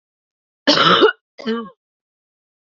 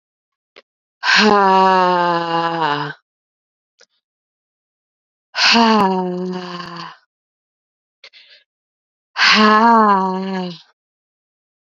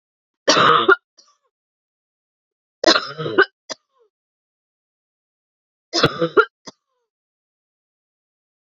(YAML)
cough_length: 2.6 s
cough_amplitude: 30550
cough_signal_mean_std_ratio: 0.38
exhalation_length: 11.8 s
exhalation_amplitude: 32768
exhalation_signal_mean_std_ratio: 0.48
three_cough_length: 8.7 s
three_cough_amplitude: 32687
three_cough_signal_mean_std_ratio: 0.27
survey_phase: beta (2021-08-13 to 2022-03-07)
age: 18-44
gender: Female
wearing_mask: 'No'
symptom_cough_any: true
symptom_new_continuous_cough: true
symptom_runny_or_blocked_nose: true
symptom_diarrhoea: true
symptom_fatigue: true
symptom_fever_high_temperature: true
symptom_headache: true
symptom_change_to_sense_of_smell_or_taste: true
symptom_other: true
symptom_onset: 2 days
smoker_status: Ex-smoker
respiratory_condition_asthma: false
respiratory_condition_other: false
recruitment_source: Test and Trace
submission_delay: 1 day
covid_test_result: Positive
covid_test_method: RT-qPCR
covid_ct_value: 25.0
covid_ct_gene: N gene